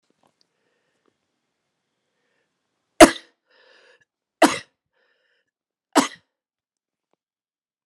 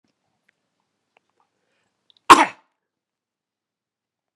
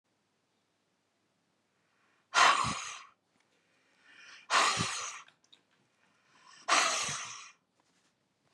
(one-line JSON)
{"three_cough_length": "7.9 s", "three_cough_amplitude": 32768, "three_cough_signal_mean_std_ratio": 0.13, "cough_length": "4.4 s", "cough_amplitude": 32768, "cough_signal_mean_std_ratio": 0.13, "exhalation_length": "8.5 s", "exhalation_amplitude": 10572, "exhalation_signal_mean_std_ratio": 0.34, "survey_phase": "beta (2021-08-13 to 2022-03-07)", "age": "45-64", "gender": "Male", "wearing_mask": "No", "symptom_cough_any": true, "symptom_runny_or_blocked_nose": true, "symptom_sore_throat": true, "symptom_onset": "5 days", "smoker_status": "Ex-smoker", "respiratory_condition_asthma": false, "respiratory_condition_other": false, "recruitment_source": "REACT", "submission_delay": "10 days", "covid_test_result": "Negative", "covid_test_method": "RT-qPCR"}